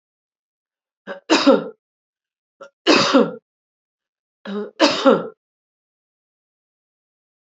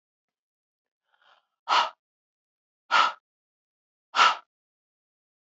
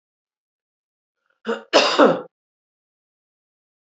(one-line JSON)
{"three_cough_length": "7.6 s", "three_cough_amplitude": 27794, "three_cough_signal_mean_std_ratio": 0.31, "exhalation_length": "5.5 s", "exhalation_amplitude": 17311, "exhalation_signal_mean_std_ratio": 0.25, "cough_length": "3.8 s", "cough_amplitude": 27787, "cough_signal_mean_std_ratio": 0.27, "survey_phase": "beta (2021-08-13 to 2022-03-07)", "age": "65+", "gender": "Female", "wearing_mask": "No", "symptom_none": true, "smoker_status": "Ex-smoker", "respiratory_condition_asthma": false, "respiratory_condition_other": false, "recruitment_source": "REACT", "submission_delay": "5 days", "covid_test_result": "Negative", "covid_test_method": "RT-qPCR", "influenza_a_test_result": "Negative", "influenza_b_test_result": "Negative"}